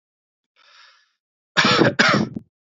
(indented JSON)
{
  "cough_length": "2.6 s",
  "cough_amplitude": 26082,
  "cough_signal_mean_std_ratio": 0.41,
  "survey_phase": "alpha (2021-03-01 to 2021-08-12)",
  "age": "18-44",
  "gender": "Male",
  "wearing_mask": "No",
  "symptom_none": true,
  "smoker_status": "Never smoked",
  "respiratory_condition_asthma": false,
  "respiratory_condition_other": false,
  "recruitment_source": "REACT",
  "submission_delay": "1 day",
  "covid_test_result": "Negative",
  "covid_test_method": "RT-qPCR"
}